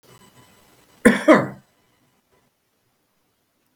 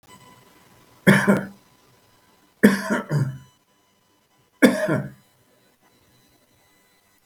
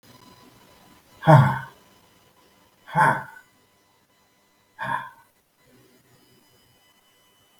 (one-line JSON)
{"cough_length": "3.8 s", "cough_amplitude": 32768, "cough_signal_mean_std_ratio": 0.22, "three_cough_length": "7.3 s", "three_cough_amplitude": 32768, "three_cough_signal_mean_std_ratio": 0.31, "exhalation_length": "7.6 s", "exhalation_amplitude": 30458, "exhalation_signal_mean_std_ratio": 0.24, "survey_phase": "beta (2021-08-13 to 2022-03-07)", "age": "65+", "gender": "Male", "wearing_mask": "No", "symptom_fatigue": true, "symptom_onset": "12 days", "smoker_status": "Ex-smoker", "respiratory_condition_asthma": true, "respiratory_condition_other": false, "recruitment_source": "REACT", "submission_delay": "2 days", "covid_test_result": "Negative", "covid_test_method": "RT-qPCR", "influenza_a_test_result": "Negative", "influenza_b_test_result": "Negative"}